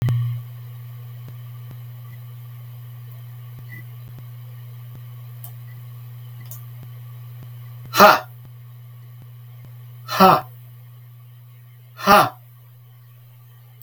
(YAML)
exhalation_length: 13.8 s
exhalation_amplitude: 32768
exhalation_signal_mean_std_ratio: 0.37
survey_phase: beta (2021-08-13 to 2022-03-07)
age: 65+
gender: Male
wearing_mask: 'No'
symptom_none: true
symptom_onset: 8 days
smoker_status: Never smoked
respiratory_condition_asthma: false
respiratory_condition_other: false
recruitment_source: REACT
submission_delay: 2 days
covid_test_result: Negative
covid_test_method: RT-qPCR
influenza_a_test_result: Negative
influenza_b_test_result: Negative